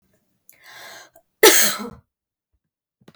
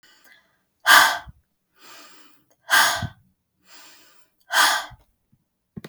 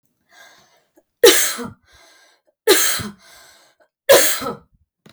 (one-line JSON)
{"cough_length": "3.2 s", "cough_amplitude": 32768, "cough_signal_mean_std_ratio": 0.26, "exhalation_length": "5.9 s", "exhalation_amplitude": 32766, "exhalation_signal_mean_std_ratio": 0.31, "three_cough_length": "5.1 s", "three_cough_amplitude": 32768, "three_cough_signal_mean_std_ratio": 0.35, "survey_phase": "beta (2021-08-13 to 2022-03-07)", "age": "18-44", "gender": "Female", "wearing_mask": "No", "symptom_none": true, "smoker_status": "Never smoked", "respiratory_condition_asthma": false, "respiratory_condition_other": false, "recruitment_source": "REACT", "submission_delay": "1 day", "covid_test_result": "Negative", "covid_test_method": "RT-qPCR"}